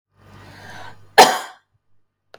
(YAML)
cough_length: 2.4 s
cough_amplitude: 32768
cough_signal_mean_std_ratio: 0.24
survey_phase: beta (2021-08-13 to 2022-03-07)
age: 45-64
gender: Female
wearing_mask: 'No'
symptom_none: true
smoker_status: Current smoker (e-cigarettes or vapes only)
respiratory_condition_asthma: true
respiratory_condition_other: false
recruitment_source: REACT
submission_delay: 1 day
covid_test_result: Negative
covid_test_method: RT-qPCR
influenza_a_test_result: Negative
influenza_b_test_result: Negative